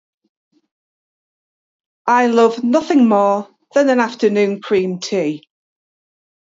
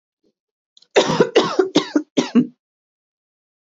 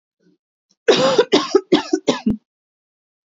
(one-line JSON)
{"exhalation_length": "6.5 s", "exhalation_amplitude": 27669, "exhalation_signal_mean_std_ratio": 0.54, "cough_length": "3.7 s", "cough_amplitude": 27266, "cough_signal_mean_std_ratio": 0.39, "three_cough_length": "3.2 s", "three_cough_amplitude": 27246, "three_cough_signal_mean_std_ratio": 0.42, "survey_phase": "beta (2021-08-13 to 2022-03-07)", "age": "45-64", "gender": "Female", "wearing_mask": "No", "symptom_none": true, "smoker_status": "Never smoked", "respiratory_condition_asthma": false, "respiratory_condition_other": false, "recruitment_source": "REACT", "submission_delay": "2 days", "covid_test_result": "Negative", "covid_test_method": "RT-qPCR", "covid_ct_value": 37.4, "covid_ct_gene": "N gene", "influenza_a_test_result": "Negative", "influenza_b_test_result": "Negative"}